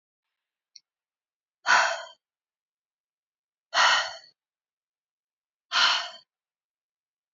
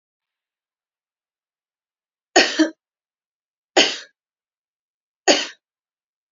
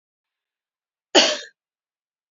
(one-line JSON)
{"exhalation_length": "7.3 s", "exhalation_amplitude": 14296, "exhalation_signal_mean_std_ratio": 0.29, "three_cough_length": "6.3 s", "three_cough_amplitude": 30915, "three_cough_signal_mean_std_ratio": 0.23, "cough_length": "2.3 s", "cough_amplitude": 27218, "cough_signal_mean_std_ratio": 0.23, "survey_phase": "beta (2021-08-13 to 2022-03-07)", "age": "18-44", "gender": "Female", "wearing_mask": "No", "symptom_none": true, "smoker_status": "Never smoked", "respiratory_condition_asthma": false, "respiratory_condition_other": false, "recruitment_source": "REACT", "submission_delay": "1 day", "covid_test_result": "Negative", "covid_test_method": "RT-qPCR", "influenza_a_test_result": "Negative", "influenza_b_test_result": "Negative"}